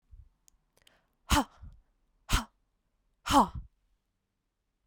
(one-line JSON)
{"exhalation_length": "4.9 s", "exhalation_amplitude": 9970, "exhalation_signal_mean_std_ratio": 0.25, "survey_phase": "beta (2021-08-13 to 2022-03-07)", "age": "18-44", "gender": "Female", "wearing_mask": "No", "symptom_runny_or_blocked_nose": true, "smoker_status": "Never smoked", "respiratory_condition_asthma": false, "respiratory_condition_other": false, "recruitment_source": "Test and Trace", "submission_delay": "2 days", "covid_test_result": "Positive", "covid_test_method": "RT-qPCR", "covid_ct_value": 18.8, "covid_ct_gene": "ORF1ab gene", "covid_ct_mean": 20.3, "covid_viral_load": "220000 copies/ml", "covid_viral_load_category": "Low viral load (10K-1M copies/ml)"}